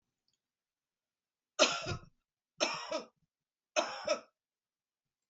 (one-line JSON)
{"three_cough_length": "5.3 s", "three_cough_amplitude": 8193, "three_cough_signal_mean_std_ratio": 0.31, "survey_phase": "beta (2021-08-13 to 2022-03-07)", "age": "65+", "gender": "Female", "wearing_mask": "No", "symptom_cough_any": true, "symptom_fatigue": true, "symptom_onset": "6 days", "smoker_status": "Never smoked", "respiratory_condition_asthma": false, "respiratory_condition_other": false, "recruitment_source": "Test and Trace", "submission_delay": "2 days", "covid_test_result": "Positive", "covid_test_method": "RT-qPCR", "covid_ct_value": 17.4, "covid_ct_gene": "ORF1ab gene", "covid_ct_mean": 17.5, "covid_viral_load": "1800000 copies/ml", "covid_viral_load_category": "High viral load (>1M copies/ml)"}